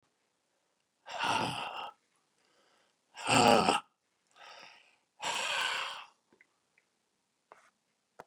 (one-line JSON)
{"exhalation_length": "8.3 s", "exhalation_amplitude": 10675, "exhalation_signal_mean_std_ratio": 0.34, "survey_phase": "beta (2021-08-13 to 2022-03-07)", "age": "65+", "gender": "Male", "wearing_mask": "No", "symptom_none": true, "smoker_status": "Ex-smoker", "respiratory_condition_asthma": false, "respiratory_condition_other": true, "recruitment_source": "REACT", "submission_delay": "0 days", "covid_test_result": "Negative", "covid_test_method": "RT-qPCR", "influenza_a_test_result": "Negative", "influenza_b_test_result": "Negative"}